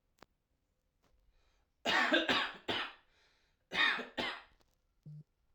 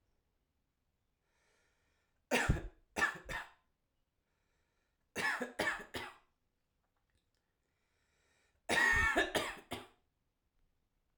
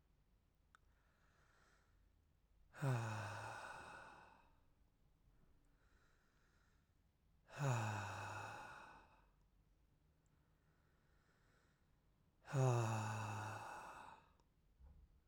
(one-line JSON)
{"cough_length": "5.5 s", "cough_amplitude": 4600, "cough_signal_mean_std_ratio": 0.4, "three_cough_length": "11.2 s", "three_cough_amplitude": 4178, "three_cough_signal_mean_std_ratio": 0.34, "exhalation_length": "15.3 s", "exhalation_amplitude": 1599, "exhalation_signal_mean_std_ratio": 0.41, "survey_phase": "alpha (2021-03-01 to 2021-08-12)", "age": "18-44", "gender": "Male", "wearing_mask": "No", "symptom_cough_any": true, "symptom_fatigue": true, "symptom_headache": true, "symptom_onset": "3 days", "smoker_status": "Never smoked", "respiratory_condition_asthma": false, "respiratory_condition_other": false, "recruitment_source": "Test and Trace", "submission_delay": "2 days", "covid_test_result": "Positive", "covid_test_method": "RT-qPCR"}